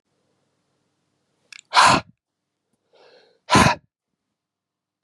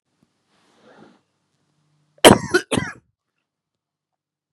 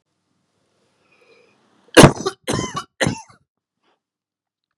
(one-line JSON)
{"exhalation_length": "5.0 s", "exhalation_amplitude": 31185, "exhalation_signal_mean_std_ratio": 0.25, "cough_length": "4.5 s", "cough_amplitude": 32768, "cough_signal_mean_std_ratio": 0.18, "three_cough_length": "4.8 s", "three_cough_amplitude": 32768, "three_cough_signal_mean_std_ratio": 0.21, "survey_phase": "beta (2021-08-13 to 2022-03-07)", "age": "18-44", "gender": "Male", "wearing_mask": "No", "symptom_cough_any": true, "symptom_runny_or_blocked_nose": true, "symptom_shortness_of_breath": true, "symptom_fatigue": true, "symptom_headache": true, "symptom_change_to_sense_of_smell_or_taste": true, "symptom_loss_of_taste": true, "symptom_onset": "4 days", "smoker_status": "Never smoked", "respiratory_condition_asthma": true, "respiratory_condition_other": false, "recruitment_source": "Test and Trace", "submission_delay": "2 days", "covid_test_result": "Positive", "covid_test_method": "ePCR"}